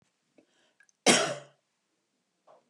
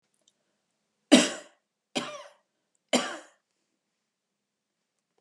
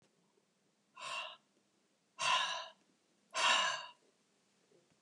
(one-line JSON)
{"cough_length": "2.7 s", "cough_amplitude": 15391, "cough_signal_mean_std_ratio": 0.24, "three_cough_length": "5.2 s", "three_cough_amplitude": 21777, "three_cough_signal_mean_std_ratio": 0.2, "exhalation_length": "5.0 s", "exhalation_amplitude": 3933, "exhalation_signal_mean_std_ratio": 0.38, "survey_phase": "beta (2021-08-13 to 2022-03-07)", "age": "65+", "gender": "Female", "wearing_mask": "No", "symptom_none": true, "smoker_status": "Never smoked", "respiratory_condition_asthma": false, "respiratory_condition_other": false, "recruitment_source": "Test and Trace", "submission_delay": "1 day", "covid_test_result": "Negative", "covid_test_method": "ePCR"}